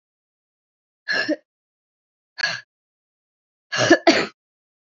{"exhalation_length": "4.9 s", "exhalation_amplitude": 28773, "exhalation_signal_mean_std_ratio": 0.29, "survey_phase": "alpha (2021-03-01 to 2021-08-12)", "age": "18-44", "gender": "Female", "wearing_mask": "No", "symptom_cough_any": true, "symptom_change_to_sense_of_smell_or_taste": true, "symptom_loss_of_taste": true, "symptom_onset": "4 days", "smoker_status": "Never smoked", "respiratory_condition_asthma": false, "respiratory_condition_other": false, "recruitment_source": "Test and Trace", "submission_delay": "2 days", "covid_test_result": "Positive", "covid_test_method": "RT-qPCR", "covid_ct_value": 15.1, "covid_ct_gene": "ORF1ab gene", "covid_ct_mean": 15.5, "covid_viral_load": "8500000 copies/ml", "covid_viral_load_category": "High viral load (>1M copies/ml)"}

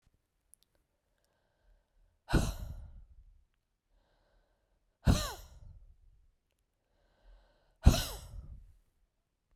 {"exhalation_length": "9.6 s", "exhalation_amplitude": 16161, "exhalation_signal_mean_std_ratio": 0.22, "survey_phase": "beta (2021-08-13 to 2022-03-07)", "age": "18-44", "gender": "Female", "wearing_mask": "No", "symptom_cough_any": true, "symptom_runny_or_blocked_nose": true, "symptom_sore_throat": true, "symptom_fatigue": true, "symptom_headache": true, "smoker_status": "Never smoked", "respiratory_condition_asthma": false, "respiratory_condition_other": false, "recruitment_source": "Test and Trace", "submission_delay": "1 day", "covid_test_result": "Positive", "covid_test_method": "RT-qPCR", "covid_ct_value": 26.0, "covid_ct_gene": "N gene"}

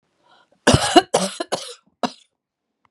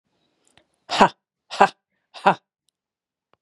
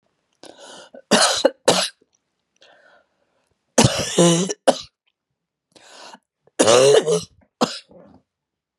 {"cough_length": "2.9 s", "cough_amplitude": 32767, "cough_signal_mean_std_ratio": 0.32, "exhalation_length": "3.4 s", "exhalation_amplitude": 32767, "exhalation_signal_mean_std_ratio": 0.22, "three_cough_length": "8.8 s", "three_cough_amplitude": 31823, "three_cough_signal_mean_std_ratio": 0.38, "survey_phase": "beta (2021-08-13 to 2022-03-07)", "age": "45-64", "gender": "Female", "wearing_mask": "No", "symptom_cough_any": true, "symptom_runny_or_blocked_nose": true, "symptom_sore_throat": true, "symptom_fatigue": true, "symptom_headache": true, "symptom_onset": "3 days", "smoker_status": "Ex-smoker", "respiratory_condition_asthma": false, "respiratory_condition_other": false, "recruitment_source": "Test and Trace", "submission_delay": "2 days", "covid_test_result": "Positive", "covid_test_method": "RT-qPCR", "covid_ct_value": 27.6, "covid_ct_gene": "ORF1ab gene"}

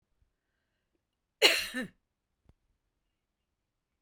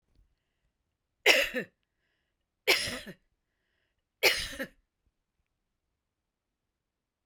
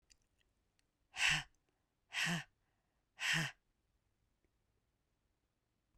{"cough_length": "4.0 s", "cough_amplitude": 15372, "cough_signal_mean_std_ratio": 0.2, "three_cough_length": "7.3 s", "three_cough_amplitude": 17402, "three_cough_signal_mean_std_ratio": 0.25, "exhalation_length": "6.0 s", "exhalation_amplitude": 2826, "exhalation_signal_mean_std_ratio": 0.3, "survey_phase": "beta (2021-08-13 to 2022-03-07)", "age": "45-64", "gender": "Female", "wearing_mask": "No", "symptom_none": true, "symptom_onset": "7 days", "smoker_status": "Never smoked", "respiratory_condition_asthma": false, "respiratory_condition_other": false, "recruitment_source": "REACT", "submission_delay": "1 day", "covid_test_result": "Negative", "covid_test_method": "RT-qPCR"}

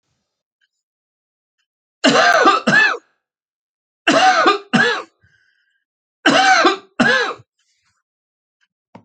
{"three_cough_length": "9.0 s", "three_cough_amplitude": 32768, "three_cough_signal_mean_std_ratio": 0.44, "survey_phase": "alpha (2021-03-01 to 2021-08-12)", "age": "65+", "gender": "Male", "wearing_mask": "No", "symptom_none": true, "smoker_status": "Never smoked", "respiratory_condition_asthma": false, "respiratory_condition_other": false, "recruitment_source": "REACT", "submission_delay": "1 day", "covid_test_result": "Negative", "covid_test_method": "RT-qPCR"}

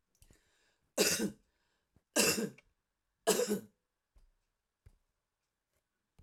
{"three_cough_length": "6.2 s", "three_cough_amplitude": 6597, "three_cough_signal_mean_std_ratio": 0.31, "survey_phase": "alpha (2021-03-01 to 2021-08-12)", "age": "65+", "gender": "Female", "wearing_mask": "No", "symptom_none": true, "smoker_status": "Ex-smoker", "respiratory_condition_asthma": false, "respiratory_condition_other": false, "recruitment_source": "REACT", "submission_delay": "3 days", "covid_test_result": "Negative", "covid_test_method": "RT-qPCR"}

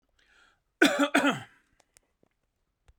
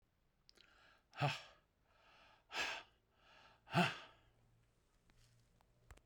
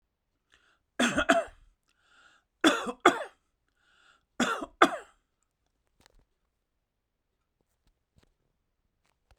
{"cough_length": "3.0 s", "cough_amplitude": 14777, "cough_signal_mean_std_ratio": 0.31, "exhalation_length": "6.1 s", "exhalation_amplitude": 2698, "exhalation_signal_mean_std_ratio": 0.29, "three_cough_length": "9.4 s", "three_cough_amplitude": 18759, "three_cough_signal_mean_std_ratio": 0.24, "survey_phase": "beta (2021-08-13 to 2022-03-07)", "age": "65+", "gender": "Male", "wearing_mask": "No", "symptom_none": true, "smoker_status": "Ex-smoker", "respiratory_condition_asthma": false, "respiratory_condition_other": false, "recruitment_source": "REACT", "submission_delay": "2 days", "covid_test_result": "Negative", "covid_test_method": "RT-qPCR"}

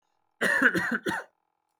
{"cough_length": "1.8 s", "cough_amplitude": 13429, "cough_signal_mean_std_ratio": 0.51, "survey_phase": "beta (2021-08-13 to 2022-03-07)", "age": "18-44", "gender": "Male", "wearing_mask": "No", "symptom_cough_any": true, "symptom_sore_throat": true, "symptom_onset": "5 days", "smoker_status": "Ex-smoker", "respiratory_condition_asthma": false, "respiratory_condition_other": false, "recruitment_source": "REACT", "submission_delay": "2 days", "covid_test_result": "Negative", "covid_test_method": "RT-qPCR"}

